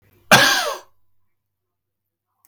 {"cough_length": "2.5 s", "cough_amplitude": 32768, "cough_signal_mean_std_ratio": 0.3, "survey_phase": "beta (2021-08-13 to 2022-03-07)", "age": "45-64", "gender": "Male", "wearing_mask": "No", "symptom_none": true, "smoker_status": "Never smoked", "respiratory_condition_asthma": false, "respiratory_condition_other": false, "recruitment_source": "REACT", "submission_delay": "1 day", "covid_test_result": "Negative", "covid_test_method": "RT-qPCR", "influenza_a_test_result": "Negative", "influenza_b_test_result": "Negative"}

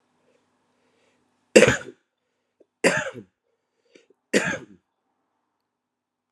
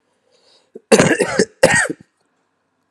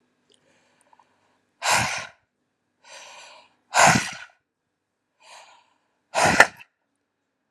{"three_cough_length": "6.3 s", "three_cough_amplitude": 32767, "three_cough_signal_mean_std_ratio": 0.22, "cough_length": "2.9 s", "cough_amplitude": 32768, "cough_signal_mean_std_ratio": 0.38, "exhalation_length": "7.5 s", "exhalation_amplitude": 32768, "exhalation_signal_mean_std_ratio": 0.27, "survey_phase": "alpha (2021-03-01 to 2021-08-12)", "age": "18-44", "gender": "Male", "wearing_mask": "No", "symptom_new_continuous_cough": true, "symptom_diarrhoea": true, "symptom_fever_high_temperature": true, "symptom_headache": true, "symptom_onset": "5 days", "smoker_status": "Current smoker (1 to 10 cigarettes per day)", "respiratory_condition_asthma": false, "respiratory_condition_other": false, "recruitment_source": "Test and Trace", "submission_delay": "2 days", "covid_test_result": "Positive", "covid_test_method": "RT-qPCR", "covid_ct_value": 27.9, "covid_ct_gene": "N gene"}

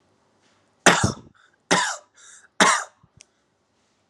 {"three_cough_length": "4.1 s", "three_cough_amplitude": 30142, "three_cough_signal_mean_std_ratio": 0.31, "survey_phase": "alpha (2021-03-01 to 2021-08-12)", "age": "18-44", "gender": "Male", "wearing_mask": "Yes", "symptom_none": true, "smoker_status": "Current smoker (1 to 10 cigarettes per day)", "respiratory_condition_asthma": false, "respiratory_condition_other": false, "recruitment_source": "Test and Trace", "submission_delay": "0 days", "covid_test_result": "Negative", "covid_test_method": "LFT"}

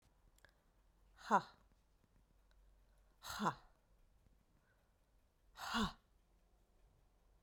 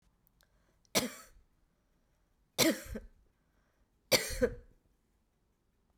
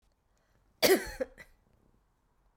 {"exhalation_length": "7.4 s", "exhalation_amplitude": 3437, "exhalation_signal_mean_std_ratio": 0.25, "three_cough_length": "6.0 s", "three_cough_amplitude": 9646, "three_cough_signal_mean_std_ratio": 0.27, "cough_length": "2.6 s", "cough_amplitude": 9071, "cough_signal_mean_std_ratio": 0.26, "survey_phase": "beta (2021-08-13 to 2022-03-07)", "age": "65+", "gender": "Female", "wearing_mask": "No", "symptom_runny_or_blocked_nose": true, "symptom_sore_throat": true, "symptom_abdominal_pain": true, "symptom_fatigue": true, "symptom_headache": true, "symptom_other": true, "smoker_status": "Never smoked", "respiratory_condition_asthma": false, "respiratory_condition_other": false, "recruitment_source": "Test and Trace", "submission_delay": "1 day", "covid_test_result": "Positive", "covid_test_method": "RT-qPCR"}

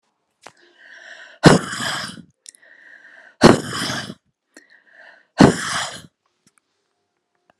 {"exhalation_length": "7.6 s", "exhalation_amplitude": 32768, "exhalation_signal_mean_std_ratio": 0.27, "survey_phase": "alpha (2021-03-01 to 2021-08-12)", "age": "45-64", "gender": "Female", "wearing_mask": "No", "symptom_none": true, "smoker_status": "Never smoked", "respiratory_condition_asthma": false, "respiratory_condition_other": false, "recruitment_source": "REACT", "submission_delay": "3 days", "covid_test_result": "Negative", "covid_test_method": "RT-qPCR"}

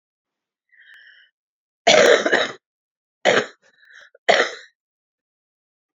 {"three_cough_length": "6.0 s", "three_cough_amplitude": 32767, "three_cough_signal_mean_std_ratio": 0.31, "survey_phase": "beta (2021-08-13 to 2022-03-07)", "age": "45-64", "gender": "Female", "wearing_mask": "No", "symptom_cough_any": true, "symptom_new_continuous_cough": true, "symptom_runny_or_blocked_nose": true, "symptom_sore_throat": true, "symptom_abdominal_pain": true, "symptom_fatigue": true, "symptom_fever_high_temperature": true, "symptom_headache": true, "symptom_other": true, "symptom_onset": "3 days", "smoker_status": "Ex-smoker", "respiratory_condition_asthma": true, "respiratory_condition_other": false, "recruitment_source": "Test and Trace", "submission_delay": "2 days", "covid_test_result": "Positive", "covid_test_method": "RT-qPCR", "covid_ct_value": 15.3, "covid_ct_gene": "ORF1ab gene", "covid_ct_mean": 16.8, "covid_viral_load": "3100000 copies/ml", "covid_viral_load_category": "High viral load (>1M copies/ml)"}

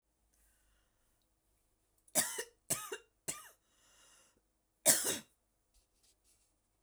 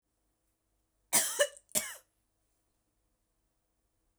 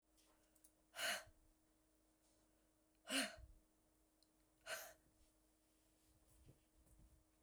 {"three_cough_length": "6.8 s", "three_cough_amplitude": 8794, "three_cough_signal_mean_std_ratio": 0.24, "cough_length": "4.2 s", "cough_amplitude": 7793, "cough_signal_mean_std_ratio": 0.24, "exhalation_length": "7.4 s", "exhalation_amplitude": 1189, "exhalation_signal_mean_std_ratio": 0.3, "survey_phase": "beta (2021-08-13 to 2022-03-07)", "age": "45-64", "gender": "Female", "wearing_mask": "No", "symptom_none": true, "smoker_status": "Never smoked", "respiratory_condition_asthma": false, "respiratory_condition_other": false, "recruitment_source": "REACT", "submission_delay": "1 day", "covid_test_result": "Negative", "covid_test_method": "RT-qPCR"}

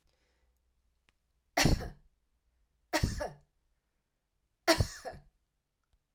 {"three_cough_length": "6.1 s", "three_cough_amplitude": 9812, "three_cough_signal_mean_std_ratio": 0.27, "survey_phase": "alpha (2021-03-01 to 2021-08-12)", "age": "45-64", "gender": "Female", "wearing_mask": "No", "symptom_none": true, "smoker_status": "Never smoked", "respiratory_condition_asthma": false, "respiratory_condition_other": false, "recruitment_source": "REACT", "submission_delay": "2 days", "covid_test_result": "Negative", "covid_test_method": "RT-qPCR"}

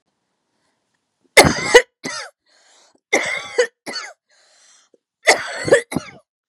{"three_cough_length": "6.5 s", "three_cough_amplitude": 32768, "three_cough_signal_mean_std_ratio": 0.31, "survey_phase": "beta (2021-08-13 to 2022-03-07)", "age": "18-44", "gender": "Female", "wearing_mask": "No", "symptom_none": true, "smoker_status": "Never smoked", "respiratory_condition_asthma": false, "respiratory_condition_other": false, "recruitment_source": "REACT", "submission_delay": "1 day", "covid_test_result": "Negative", "covid_test_method": "RT-qPCR", "covid_ct_value": 38.1, "covid_ct_gene": "N gene", "influenza_a_test_result": "Negative", "influenza_b_test_result": "Negative"}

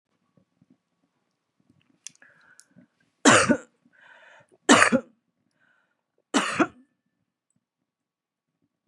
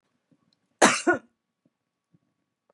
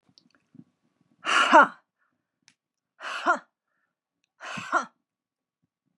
{"three_cough_length": "8.9 s", "three_cough_amplitude": 32134, "three_cough_signal_mean_std_ratio": 0.23, "cough_length": "2.7 s", "cough_amplitude": 27229, "cough_signal_mean_std_ratio": 0.23, "exhalation_length": "6.0 s", "exhalation_amplitude": 22113, "exhalation_signal_mean_std_ratio": 0.26, "survey_phase": "beta (2021-08-13 to 2022-03-07)", "age": "65+", "gender": "Female", "wearing_mask": "No", "symptom_other": true, "smoker_status": "Never smoked", "respiratory_condition_asthma": false, "respiratory_condition_other": false, "recruitment_source": "Test and Trace", "submission_delay": "1 day", "covid_test_result": "Negative", "covid_test_method": "RT-qPCR"}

